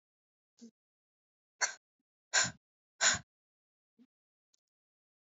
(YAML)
exhalation_length: 5.4 s
exhalation_amplitude: 7290
exhalation_signal_mean_std_ratio: 0.21
survey_phase: alpha (2021-03-01 to 2021-08-12)
age: 18-44
gender: Female
wearing_mask: 'No'
symptom_cough_any: true
symptom_fatigue: true
symptom_change_to_sense_of_smell_or_taste: true
symptom_loss_of_taste: true
symptom_onset: 8 days
smoker_status: Never smoked
respiratory_condition_asthma: false
respiratory_condition_other: false
recruitment_source: Test and Trace
submission_delay: 3 days
covid_test_result: Positive
covid_test_method: RT-qPCR
covid_ct_value: 21.5
covid_ct_gene: ORF1ab gene